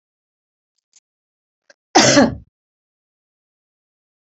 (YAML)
cough_length: 4.3 s
cough_amplitude: 31619
cough_signal_mean_std_ratio: 0.23
survey_phase: beta (2021-08-13 to 2022-03-07)
age: 65+
gender: Female
wearing_mask: 'No'
symptom_none: true
smoker_status: Never smoked
respiratory_condition_asthma: false
respiratory_condition_other: false
recruitment_source: REACT
submission_delay: 3 days
covid_test_result: Negative
covid_test_method: RT-qPCR
influenza_a_test_result: Negative
influenza_b_test_result: Negative